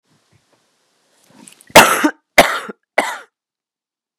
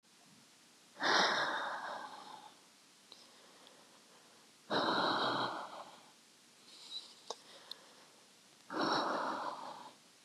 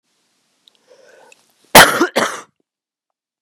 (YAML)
three_cough_length: 4.2 s
three_cough_amplitude: 32768
three_cough_signal_mean_std_ratio: 0.28
exhalation_length: 10.2 s
exhalation_amplitude: 4382
exhalation_signal_mean_std_ratio: 0.51
cough_length: 3.4 s
cough_amplitude: 32768
cough_signal_mean_std_ratio: 0.26
survey_phase: beta (2021-08-13 to 2022-03-07)
age: 18-44
gender: Male
wearing_mask: 'No'
symptom_runny_or_blocked_nose: true
smoker_status: Current smoker (1 to 10 cigarettes per day)
respiratory_condition_asthma: false
respiratory_condition_other: false
recruitment_source: REACT
submission_delay: 1 day
covid_test_result: Negative
covid_test_method: RT-qPCR
influenza_a_test_result: Negative
influenza_b_test_result: Negative